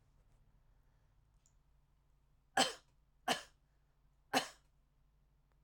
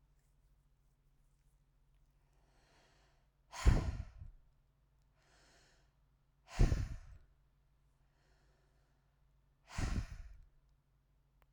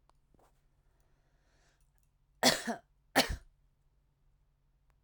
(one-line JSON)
{"three_cough_length": "5.6 s", "three_cough_amplitude": 5081, "three_cough_signal_mean_std_ratio": 0.22, "exhalation_length": "11.5 s", "exhalation_amplitude": 5323, "exhalation_signal_mean_std_ratio": 0.24, "cough_length": "5.0 s", "cough_amplitude": 8661, "cough_signal_mean_std_ratio": 0.22, "survey_phase": "alpha (2021-03-01 to 2021-08-12)", "age": "45-64", "gender": "Female", "wearing_mask": "No", "symptom_none": true, "smoker_status": "Ex-smoker", "respiratory_condition_asthma": true, "respiratory_condition_other": false, "recruitment_source": "REACT", "submission_delay": "2 days", "covid_test_result": "Negative", "covid_test_method": "RT-qPCR"}